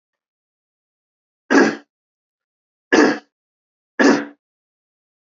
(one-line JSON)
{"three_cough_length": "5.4 s", "three_cough_amplitude": 28454, "three_cough_signal_mean_std_ratio": 0.29, "survey_phase": "beta (2021-08-13 to 2022-03-07)", "age": "18-44", "gender": "Male", "wearing_mask": "No", "symptom_fatigue": true, "symptom_headache": true, "symptom_change_to_sense_of_smell_or_taste": true, "symptom_onset": "4 days", "smoker_status": "Never smoked", "respiratory_condition_asthma": false, "respiratory_condition_other": false, "recruitment_source": "Test and Trace", "submission_delay": "2 days", "covid_test_result": "Positive", "covid_test_method": "ePCR"}